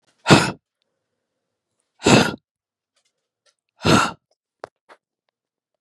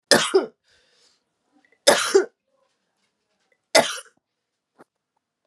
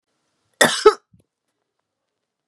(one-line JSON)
{"exhalation_length": "5.8 s", "exhalation_amplitude": 32768, "exhalation_signal_mean_std_ratio": 0.26, "three_cough_length": "5.5 s", "three_cough_amplitude": 31186, "three_cough_signal_mean_std_ratio": 0.28, "cough_length": "2.5 s", "cough_amplitude": 32768, "cough_signal_mean_std_ratio": 0.21, "survey_phase": "beta (2021-08-13 to 2022-03-07)", "age": "45-64", "gender": "Female", "wearing_mask": "No", "symptom_cough_any": true, "symptom_new_continuous_cough": true, "symptom_fatigue": true, "symptom_headache": true, "symptom_loss_of_taste": true, "symptom_other": true, "symptom_onset": "7 days", "smoker_status": "Ex-smoker", "respiratory_condition_asthma": false, "respiratory_condition_other": false, "recruitment_source": "Test and Trace", "submission_delay": "2 days", "covid_test_result": "Positive", "covid_test_method": "RT-qPCR"}